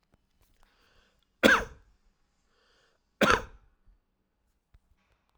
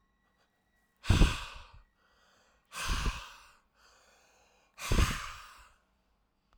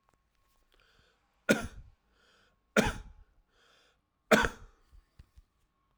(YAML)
cough_length: 5.4 s
cough_amplitude: 22286
cough_signal_mean_std_ratio: 0.21
exhalation_length: 6.6 s
exhalation_amplitude: 9329
exhalation_signal_mean_std_ratio: 0.31
three_cough_length: 6.0 s
three_cough_amplitude: 12147
three_cough_signal_mean_std_ratio: 0.22
survey_phase: alpha (2021-03-01 to 2021-08-12)
age: 45-64
gender: Male
wearing_mask: 'No'
symptom_headache: true
symptom_change_to_sense_of_smell_or_taste: true
symptom_loss_of_taste: true
symptom_onset: 4 days
smoker_status: Ex-smoker
respiratory_condition_asthma: false
respiratory_condition_other: false
recruitment_source: Test and Trace
submission_delay: 2 days
covid_test_result: Positive
covid_test_method: RT-qPCR